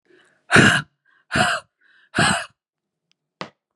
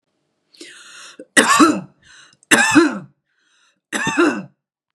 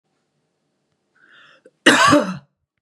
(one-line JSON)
{"exhalation_length": "3.8 s", "exhalation_amplitude": 32729, "exhalation_signal_mean_std_ratio": 0.36, "three_cough_length": "4.9 s", "three_cough_amplitude": 32768, "three_cough_signal_mean_std_ratio": 0.41, "cough_length": "2.8 s", "cough_amplitude": 32768, "cough_signal_mean_std_ratio": 0.32, "survey_phase": "beta (2021-08-13 to 2022-03-07)", "age": "45-64", "gender": "Female", "wearing_mask": "No", "symptom_none": true, "smoker_status": "Never smoked", "respiratory_condition_asthma": false, "respiratory_condition_other": false, "recruitment_source": "REACT", "submission_delay": "2 days", "covid_test_result": "Negative", "covid_test_method": "RT-qPCR"}